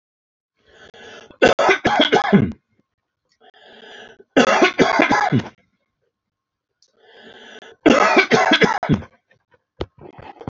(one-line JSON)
{"three_cough_length": "10.5 s", "three_cough_amplitude": 29302, "three_cough_signal_mean_std_ratio": 0.43, "survey_phase": "alpha (2021-03-01 to 2021-08-12)", "age": "45-64", "gender": "Male", "wearing_mask": "No", "symptom_none": true, "smoker_status": "Ex-smoker", "respiratory_condition_asthma": false, "respiratory_condition_other": false, "recruitment_source": "REACT", "submission_delay": "10 days", "covid_test_result": "Negative", "covid_test_method": "RT-qPCR"}